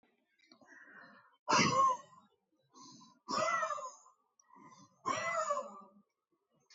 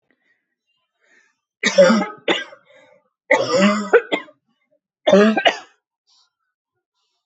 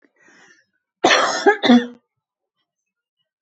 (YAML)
exhalation_length: 6.7 s
exhalation_amplitude: 4617
exhalation_signal_mean_std_ratio: 0.42
three_cough_length: 7.3 s
three_cough_amplitude: 28639
three_cough_signal_mean_std_ratio: 0.38
cough_length: 3.4 s
cough_amplitude: 26963
cough_signal_mean_std_ratio: 0.35
survey_phase: beta (2021-08-13 to 2022-03-07)
age: 45-64
gender: Female
wearing_mask: 'No'
symptom_shortness_of_breath: true
symptom_fatigue: true
symptom_headache: true
symptom_onset: 12 days
smoker_status: Ex-smoker
respiratory_condition_asthma: false
respiratory_condition_other: false
recruitment_source: REACT
submission_delay: 1 day
covid_test_result: Negative
covid_test_method: RT-qPCR
influenza_a_test_result: Negative
influenza_b_test_result: Negative